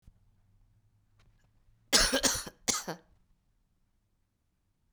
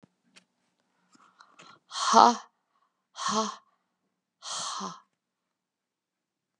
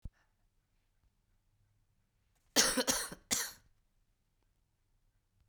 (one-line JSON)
{"three_cough_length": "4.9 s", "three_cough_amplitude": 11897, "three_cough_signal_mean_std_ratio": 0.28, "exhalation_length": "6.6 s", "exhalation_amplitude": 25918, "exhalation_signal_mean_std_ratio": 0.24, "cough_length": "5.5 s", "cough_amplitude": 7681, "cough_signal_mean_std_ratio": 0.26, "survey_phase": "beta (2021-08-13 to 2022-03-07)", "age": "45-64", "gender": "Female", "wearing_mask": "No", "symptom_cough_any": true, "symptom_sore_throat": true, "symptom_onset": "8 days", "smoker_status": "Never smoked", "respiratory_condition_asthma": false, "respiratory_condition_other": false, "recruitment_source": "Test and Trace", "submission_delay": "2 days", "covid_test_result": "Positive", "covid_test_method": "LAMP"}